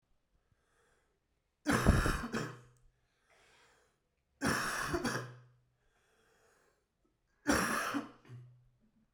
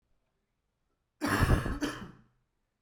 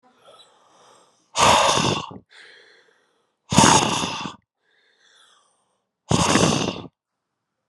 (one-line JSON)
{"three_cough_length": "9.1 s", "three_cough_amplitude": 8182, "three_cough_signal_mean_std_ratio": 0.39, "cough_length": "2.8 s", "cough_amplitude": 7256, "cough_signal_mean_std_ratio": 0.39, "exhalation_length": "7.7 s", "exhalation_amplitude": 32767, "exhalation_signal_mean_std_ratio": 0.4, "survey_phase": "alpha (2021-03-01 to 2021-08-12)", "age": "45-64", "gender": "Male", "wearing_mask": "No", "symptom_cough_any": true, "symptom_fatigue": true, "symptom_headache": true, "symptom_onset": "3 days", "smoker_status": "Never smoked", "respiratory_condition_asthma": true, "respiratory_condition_other": false, "recruitment_source": "Test and Trace", "submission_delay": "1 day", "covid_test_result": "Positive", "covid_test_method": "RT-qPCR", "covid_ct_value": 14.8, "covid_ct_gene": "ORF1ab gene", "covid_ct_mean": 15.2, "covid_viral_load": "11000000 copies/ml", "covid_viral_load_category": "High viral load (>1M copies/ml)"}